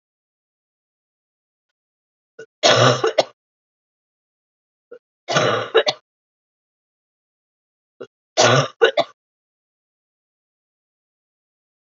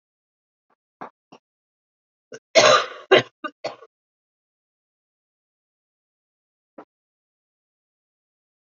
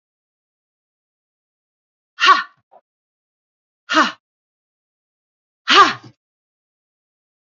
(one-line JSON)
{"three_cough_length": "11.9 s", "three_cough_amplitude": 28372, "three_cough_signal_mean_std_ratio": 0.27, "cough_length": "8.6 s", "cough_amplitude": 30072, "cough_signal_mean_std_ratio": 0.18, "exhalation_length": "7.4 s", "exhalation_amplitude": 32768, "exhalation_signal_mean_std_ratio": 0.22, "survey_phase": "alpha (2021-03-01 to 2021-08-12)", "age": "45-64", "gender": "Female", "wearing_mask": "No", "symptom_cough_any": true, "symptom_onset": "371 days", "smoker_status": "Never smoked", "respiratory_condition_asthma": false, "respiratory_condition_other": false, "recruitment_source": "Test and Trace", "submission_delay": "2 days", "covid_test_result": "Positive", "covid_test_method": "RT-qPCR", "covid_ct_value": 33.4, "covid_ct_gene": "N gene", "covid_ct_mean": 33.4, "covid_viral_load": "11 copies/ml", "covid_viral_load_category": "Minimal viral load (< 10K copies/ml)"}